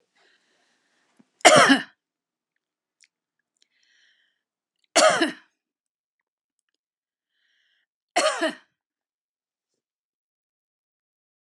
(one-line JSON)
{"three_cough_length": "11.4 s", "three_cough_amplitude": 32767, "three_cough_signal_mean_std_ratio": 0.21, "survey_phase": "alpha (2021-03-01 to 2021-08-12)", "age": "65+", "gender": "Female", "wearing_mask": "No", "symptom_none": true, "smoker_status": "Never smoked", "respiratory_condition_asthma": false, "respiratory_condition_other": false, "recruitment_source": "REACT", "submission_delay": "5 days", "covid_test_result": "Negative", "covid_test_method": "RT-qPCR"}